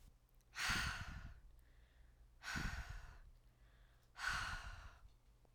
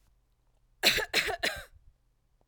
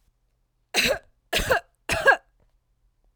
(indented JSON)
{
  "exhalation_length": "5.5 s",
  "exhalation_amplitude": 1316,
  "exhalation_signal_mean_std_ratio": 0.57,
  "cough_length": "2.5 s",
  "cough_amplitude": 16616,
  "cough_signal_mean_std_ratio": 0.38,
  "three_cough_length": "3.2 s",
  "three_cough_amplitude": 18976,
  "three_cough_signal_mean_std_ratio": 0.37,
  "survey_phase": "alpha (2021-03-01 to 2021-08-12)",
  "age": "45-64",
  "gender": "Female",
  "wearing_mask": "No",
  "symptom_none": true,
  "smoker_status": "Never smoked",
  "respiratory_condition_asthma": false,
  "respiratory_condition_other": false,
  "recruitment_source": "REACT",
  "submission_delay": "3 days",
  "covid_test_result": "Negative",
  "covid_test_method": "RT-qPCR"
}